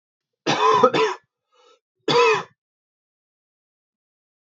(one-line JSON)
{"three_cough_length": "4.4 s", "three_cough_amplitude": 26661, "three_cough_signal_mean_std_ratio": 0.38, "survey_phase": "beta (2021-08-13 to 2022-03-07)", "age": "18-44", "gender": "Male", "wearing_mask": "No", "symptom_cough_any": true, "symptom_runny_or_blocked_nose": true, "symptom_sore_throat": true, "symptom_abdominal_pain": true, "symptom_fatigue": true, "symptom_headache": true, "smoker_status": "Never smoked", "respiratory_condition_asthma": true, "respiratory_condition_other": false, "recruitment_source": "Test and Trace", "submission_delay": "2 days", "covid_test_result": "Positive", "covid_test_method": "LFT"}